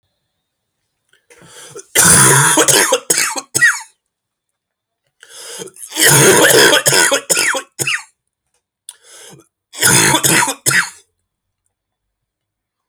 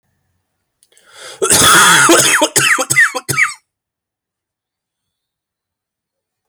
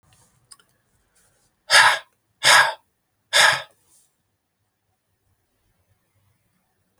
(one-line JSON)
{"three_cough_length": "12.9 s", "three_cough_amplitude": 32768, "three_cough_signal_mean_std_ratio": 0.48, "cough_length": "6.5 s", "cough_amplitude": 32768, "cough_signal_mean_std_ratio": 0.45, "exhalation_length": "7.0 s", "exhalation_amplitude": 31463, "exhalation_signal_mean_std_ratio": 0.27, "survey_phase": "alpha (2021-03-01 to 2021-08-12)", "age": "18-44", "gender": "Male", "wearing_mask": "No", "symptom_cough_any": true, "symptom_shortness_of_breath": true, "symptom_fatigue": true, "symptom_fever_high_temperature": true, "symptom_headache": true, "symptom_change_to_sense_of_smell_or_taste": true, "symptom_loss_of_taste": true, "symptom_onset": "3 days", "smoker_status": "Never smoked", "respiratory_condition_asthma": false, "respiratory_condition_other": false, "recruitment_source": "Test and Trace", "submission_delay": "1 day", "covid_test_result": "Positive", "covid_test_method": "RT-qPCR"}